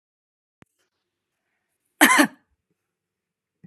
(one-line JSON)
{"cough_length": "3.7 s", "cough_amplitude": 30508, "cough_signal_mean_std_ratio": 0.2, "survey_phase": "beta (2021-08-13 to 2022-03-07)", "age": "18-44", "gender": "Female", "wearing_mask": "No", "symptom_none": true, "smoker_status": "Never smoked", "respiratory_condition_asthma": false, "respiratory_condition_other": false, "recruitment_source": "REACT", "submission_delay": "7 days", "covid_test_result": "Negative", "covid_test_method": "RT-qPCR", "influenza_a_test_result": "Negative", "influenza_b_test_result": "Negative"}